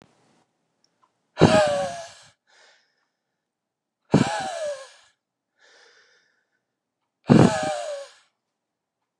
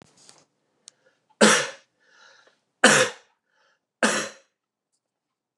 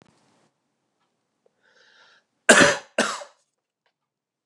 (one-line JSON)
{"exhalation_length": "9.2 s", "exhalation_amplitude": 29203, "exhalation_signal_mean_std_ratio": 0.29, "three_cough_length": "5.6 s", "three_cough_amplitude": 29203, "three_cough_signal_mean_std_ratio": 0.27, "cough_length": "4.5 s", "cough_amplitude": 29204, "cough_signal_mean_std_ratio": 0.22, "survey_phase": "beta (2021-08-13 to 2022-03-07)", "age": "18-44", "gender": "Male", "wearing_mask": "No", "symptom_cough_any": true, "symptom_runny_or_blocked_nose": true, "symptom_sore_throat": true, "symptom_fatigue": true, "symptom_headache": true, "symptom_other": true, "smoker_status": "Ex-smoker", "respiratory_condition_asthma": false, "respiratory_condition_other": false, "recruitment_source": "Test and Trace", "submission_delay": "1 day", "covid_test_result": "Positive", "covid_test_method": "LFT"}